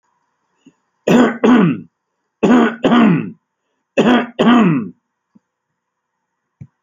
{
  "three_cough_length": "6.8 s",
  "three_cough_amplitude": 32768,
  "three_cough_signal_mean_std_ratio": 0.48,
  "survey_phase": "alpha (2021-03-01 to 2021-08-12)",
  "age": "65+",
  "gender": "Male",
  "wearing_mask": "No",
  "symptom_shortness_of_breath": true,
  "symptom_fatigue": true,
  "smoker_status": "Current smoker (11 or more cigarettes per day)",
  "respiratory_condition_asthma": false,
  "respiratory_condition_other": false,
  "recruitment_source": "REACT",
  "submission_delay": "2 days",
  "covid_test_result": "Negative",
  "covid_test_method": "RT-qPCR"
}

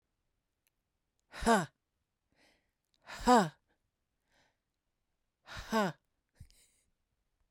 {
  "exhalation_length": "7.5 s",
  "exhalation_amplitude": 6029,
  "exhalation_signal_mean_std_ratio": 0.25,
  "survey_phase": "beta (2021-08-13 to 2022-03-07)",
  "age": "45-64",
  "gender": "Female",
  "wearing_mask": "No",
  "symptom_none": true,
  "smoker_status": "Never smoked",
  "respiratory_condition_asthma": false,
  "respiratory_condition_other": false,
  "recruitment_source": "REACT",
  "submission_delay": "2 days",
  "covid_test_result": "Negative",
  "covid_test_method": "RT-qPCR"
}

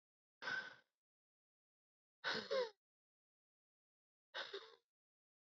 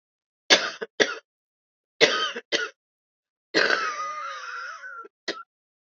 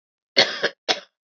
{
  "exhalation_length": "5.5 s",
  "exhalation_amplitude": 1233,
  "exhalation_signal_mean_std_ratio": 0.31,
  "three_cough_length": "5.9 s",
  "three_cough_amplitude": 32767,
  "three_cough_signal_mean_std_ratio": 0.4,
  "cough_length": "1.4 s",
  "cough_amplitude": 32767,
  "cough_signal_mean_std_ratio": 0.34,
  "survey_phase": "beta (2021-08-13 to 2022-03-07)",
  "age": "45-64",
  "gender": "Female",
  "wearing_mask": "No",
  "symptom_cough_any": true,
  "symptom_runny_or_blocked_nose": true,
  "symptom_shortness_of_breath": true,
  "symptom_sore_throat": true,
  "symptom_fatigue": true,
  "symptom_headache": true,
  "symptom_change_to_sense_of_smell_or_taste": true,
  "symptom_other": true,
  "symptom_onset": "6 days",
  "smoker_status": "Ex-smoker",
  "respiratory_condition_asthma": false,
  "respiratory_condition_other": false,
  "recruitment_source": "Test and Trace",
  "submission_delay": "2 days",
  "covid_test_result": "Positive",
  "covid_test_method": "RT-qPCR",
  "covid_ct_value": 18.2,
  "covid_ct_gene": "ORF1ab gene",
  "covid_ct_mean": 18.8,
  "covid_viral_load": "660000 copies/ml",
  "covid_viral_load_category": "Low viral load (10K-1M copies/ml)"
}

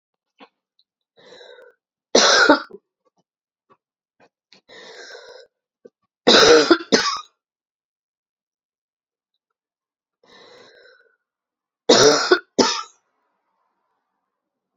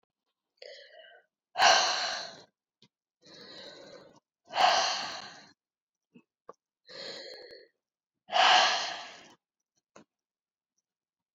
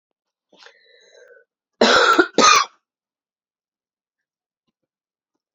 {
  "three_cough_length": "14.8 s",
  "three_cough_amplitude": 32671,
  "three_cough_signal_mean_std_ratio": 0.28,
  "exhalation_length": "11.3 s",
  "exhalation_amplitude": 12892,
  "exhalation_signal_mean_std_ratio": 0.33,
  "cough_length": "5.5 s",
  "cough_amplitude": 32767,
  "cough_signal_mean_std_ratio": 0.29,
  "survey_phase": "beta (2021-08-13 to 2022-03-07)",
  "age": "45-64",
  "gender": "Female",
  "wearing_mask": "No",
  "symptom_cough_any": true,
  "symptom_runny_or_blocked_nose": true,
  "symptom_sore_throat": true,
  "symptom_fatigue": true,
  "symptom_headache": true,
  "symptom_change_to_sense_of_smell_or_taste": true,
  "symptom_loss_of_taste": true,
  "symptom_onset": "3 days",
  "smoker_status": "Never smoked",
  "respiratory_condition_asthma": false,
  "respiratory_condition_other": false,
  "recruitment_source": "Test and Trace",
  "submission_delay": "1 day",
  "covid_test_result": "Positive",
  "covid_test_method": "ePCR"
}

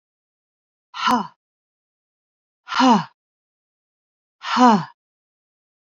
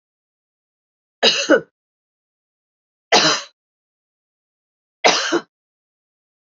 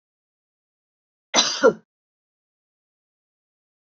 {
  "exhalation_length": "5.8 s",
  "exhalation_amplitude": 24195,
  "exhalation_signal_mean_std_ratio": 0.3,
  "three_cough_length": "6.6 s",
  "three_cough_amplitude": 32768,
  "three_cough_signal_mean_std_ratio": 0.28,
  "cough_length": "3.9 s",
  "cough_amplitude": 26807,
  "cough_signal_mean_std_ratio": 0.2,
  "survey_phase": "beta (2021-08-13 to 2022-03-07)",
  "age": "45-64",
  "gender": "Female",
  "wearing_mask": "No",
  "symptom_runny_or_blocked_nose": true,
  "symptom_fatigue": true,
  "symptom_headache": true,
  "symptom_onset": "4 days",
  "smoker_status": "Never smoked",
  "respiratory_condition_asthma": false,
  "respiratory_condition_other": false,
  "recruitment_source": "REACT",
  "submission_delay": "2 days",
  "covid_test_result": "Negative",
  "covid_test_method": "RT-qPCR",
  "influenza_a_test_result": "Unknown/Void",
  "influenza_b_test_result": "Unknown/Void"
}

